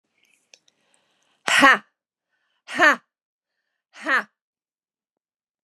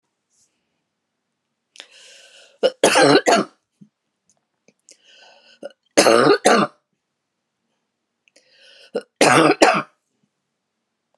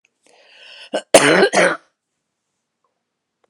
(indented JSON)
{
  "exhalation_length": "5.6 s",
  "exhalation_amplitude": 32767,
  "exhalation_signal_mean_std_ratio": 0.25,
  "three_cough_length": "11.2 s",
  "three_cough_amplitude": 32768,
  "three_cough_signal_mean_std_ratio": 0.32,
  "cough_length": "3.5 s",
  "cough_amplitude": 32768,
  "cough_signal_mean_std_ratio": 0.33,
  "survey_phase": "beta (2021-08-13 to 2022-03-07)",
  "age": "65+",
  "gender": "Female",
  "wearing_mask": "No",
  "symptom_none": true,
  "smoker_status": "Never smoked",
  "respiratory_condition_asthma": true,
  "respiratory_condition_other": false,
  "recruitment_source": "REACT",
  "submission_delay": "1 day",
  "covid_test_result": "Negative",
  "covid_test_method": "RT-qPCR",
  "influenza_a_test_result": "Negative",
  "influenza_b_test_result": "Negative"
}